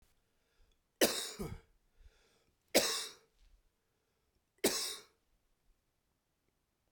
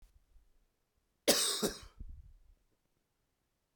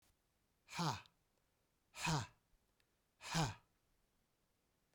{"three_cough_length": "6.9 s", "three_cough_amplitude": 7883, "three_cough_signal_mean_std_ratio": 0.28, "cough_length": "3.8 s", "cough_amplitude": 8314, "cough_signal_mean_std_ratio": 0.29, "exhalation_length": "4.9 s", "exhalation_amplitude": 1936, "exhalation_signal_mean_std_ratio": 0.33, "survey_phase": "beta (2021-08-13 to 2022-03-07)", "age": "45-64", "gender": "Male", "wearing_mask": "No", "symptom_none": true, "symptom_onset": "7 days", "smoker_status": "Ex-smoker", "respiratory_condition_asthma": false, "respiratory_condition_other": false, "recruitment_source": "REACT", "submission_delay": "1 day", "covid_test_result": "Negative", "covid_test_method": "RT-qPCR"}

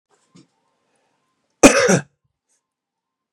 {"cough_length": "3.3 s", "cough_amplitude": 32768, "cough_signal_mean_std_ratio": 0.24, "survey_phase": "beta (2021-08-13 to 2022-03-07)", "age": "65+", "gender": "Male", "wearing_mask": "No", "symptom_sore_throat": true, "symptom_fatigue": true, "symptom_other": true, "symptom_onset": "11 days", "smoker_status": "Ex-smoker", "respiratory_condition_asthma": false, "respiratory_condition_other": false, "recruitment_source": "REACT", "submission_delay": "2 days", "covid_test_result": "Negative", "covid_test_method": "RT-qPCR", "influenza_a_test_result": "Negative", "influenza_b_test_result": "Negative"}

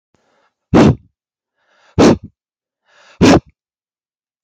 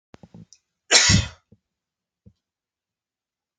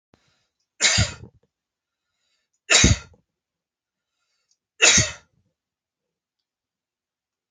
{"exhalation_length": "4.4 s", "exhalation_amplitude": 32098, "exhalation_signal_mean_std_ratio": 0.32, "cough_length": "3.6 s", "cough_amplitude": 27511, "cough_signal_mean_std_ratio": 0.25, "three_cough_length": "7.5 s", "three_cough_amplitude": 27109, "three_cough_signal_mean_std_ratio": 0.26, "survey_phase": "alpha (2021-03-01 to 2021-08-12)", "age": "18-44", "gender": "Male", "wearing_mask": "No", "symptom_none": true, "smoker_status": "Never smoked", "respiratory_condition_asthma": false, "respiratory_condition_other": false, "recruitment_source": "REACT", "submission_delay": "1 day", "covid_test_result": "Negative", "covid_test_method": "RT-qPCR"}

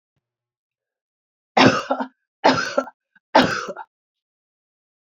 {"three_cough_length": "5.1 s", "three_cough_amplitude": 28800, "three_cough_signal_mean_std_ratio": 0.31, "survey_phase": "beta (2021-08-13 to 2022-03-07)", "age": "45-64", "gender": "Female", "wearing_mask": "No", "symptom_cough_any": true, "symptom_runny_or_blocked_nose": true, "symptom_sore_throat": true, "symptom_fatigue": true, "symptom_headache": true, "symptom_onset": "4 days", "smoker_status": "Ex-smoker", "respiratory_condition_asthma": false, "respiratory_condition_other": false, "recruitment_source": "Test and Trace", "submission_delay": "2 days", "covid_test_result": "Positive", "covid_test_method": "RT-qPCR", "covid_ct_value": 17.8, "covid_ct_gene": "ORF1ab gene"}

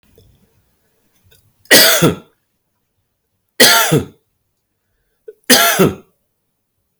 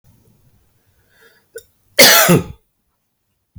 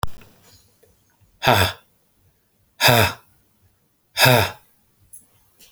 {"three_cough_length": "7.0 s", "three_cough_amplitude": 32768, "three_cough_signal_mean_std_ratio": 0.35, "cough_length": "3.6 s", "cough_amplitude": 32768, "cough_signal_mean_std_ratio": 0.3, "exhalation_length": "5.7 s", "exhalation_amplitude": 31688, "exhalation_signal_mean_std_ratio": 0.34, "survey_phase": "beta (2021-08-13 to 2022-03-07)", "age": "45-64", "gender": "Male", "wearing_mask": "No", "symptom_change_to_sense_of_smell_or_taste": true, "smoker_status": "Ex-smoker", "respiratory_condition_asthma": false, "respiratory_condition_other": false, "recruitment_source": "Test and Trace", "submission_delay": "1 day", "covid_test_result": "Negative", "covid_test_method": "RT-qPCR"}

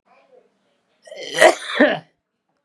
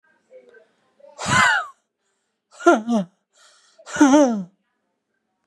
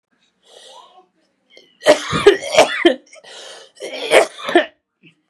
{"cough_length": "2.6 s", "cough_amplitude": 32768, "cough_signal_mean_std_ratio": 0.32, "exhalation_length": "5.5 s", "exhalation_amplitude": 31547, "exhalation_signal_mean_std_ratio": 0.37, "three_cough_length": "5.3 s", "three_cough_amplitude": 32768, "three_cough_signal_mean_std_ratio": 0.37, "survey_phase": "beta (2021-08-13 to 2022-03-07)", "age": "45-64", "gender": "Male", "wearing_mask": "No", "symptom_cough_any": true, "symptom_runny_or_blocked_nose": true, "smoker_status": "Ex-smoker", "respiratory_condition_asthma": true, "respiratory_condition_other": false, "recruitment_source": "REACT", "submission_delay": "2 days", "covid_test_result": "Negative", "covid_test_method": "RT-qPCR", "influenza_a_test_result": "Negative", "influenza_b_test_result": "Negative"}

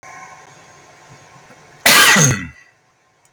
{"cough_length": "3.3 s", "cough_amplitude": 32768, "cough_signal_mean_std_ratio": 0.35, "survey_phase": "beta (2021-08-13 to 2022-03-07)", "age": "45-64", "gender": "Male", "wearing_mask": "No", "symptom_none": true, "smoker_status": "Ex-smoker", "respiratory_condition_asthma": false, "respiratory_condition_other": false, "recruitment_source": "REACT", "submission_delay": "4 days", "covid_test_result": "Negative", "covid_test_method": "RT-qPCR", "influenza_a_test_result": "Negative", "influenza_b_test_result": "Negative"}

